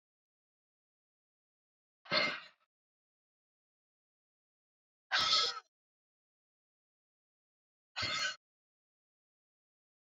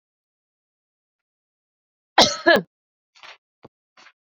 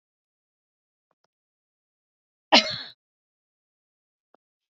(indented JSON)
{
  "exhalation_length": "10.2 s",
  "exhalation_amplitude": 4279,
  "exhalation_signal_mean_std_ratio": 0.25,
  "three_cough_length": "4.3 s",
  "three_cough_amplitude": 30935,
  "three_cough_signal_mean_std_ratio": 0.2,
  "cough_length": "4.8 s",
  "cough_amplitude": 28040,
  "cough_signal_mean_std_ratio": 0.14,
  "survey_phase": "beta (2021-08-13 to 2022-03-07)",
  "age": "45-64",
  "gender": "Female",
  "wearing_mask": "No",
  "symptom_none": true,
  "smoker_status": "Ex-smoker",
  "respiratory_condition_asthma": false,
  "respiratory_condition_other": false,
  "recruitment_source": "Test and Trace",
  "submission_delay": "2 days",
  "covid_test_result": "Positive",
  "covid_test_method": "RT-qPCR"
}